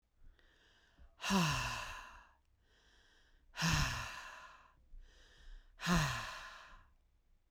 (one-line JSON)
{"exhalation_length": "7.5 s", "exhalation_amplitude": 3283, "exhalation_signal_mean_std_ratio": 0.45, "survey_phase": "beta (2021-08-13 to 2022-03-07)", "age": "45-64", "gender": "Female", "wearing_mask": "No", "symptom_none": true, "symptom_onset": "12 days", "smoker_status": "Current smoker (1 to 10 cigarettes per day)", "respiratory_condition_asthma": false, "respiratory_condition_other": false, "recruitment_source": "REACT", "submission_delay": "1 day", "covid_test_result": "Negative", "covid_test_method": "RT-qPCR"}